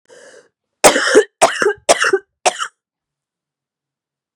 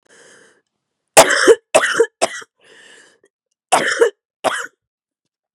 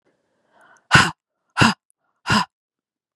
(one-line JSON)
{"cough_length": "4.4 s", "cough_amplitude": 32768, "cough_signal_mean_std_ratio": 0.36, "three_cough_length": "5.5 s", "three_cough_amplitude": 32768, "three_cough_signal_mean_std_ratio": 0.34, "exhalation_length": "3.2 s", "exhalation_amplitude": 32768, "exhalation_signal_mean_std_ratio": 0.3, "survey_phase": "beta (2021-08-13 to 2022-03-07)", "age": "18-44", "gender": "Female", "wearing_mask": "No", "symptom_cough_any": true, "symptom_new_continuous_cough": true, "symptom_sore_throat": true, "symptom_fatigue": true, "symptom_headache": true, "symptom_onset": "4 days", "smoker_status": "Never smoked", "respiratory_condition_asthma": true, "respiratory_condition_other": false, "recruitment_source": "Test and Trace", "submission_delay": "2 days", "covid_test_result": "Positive", "covid_test_method": "ePCR"}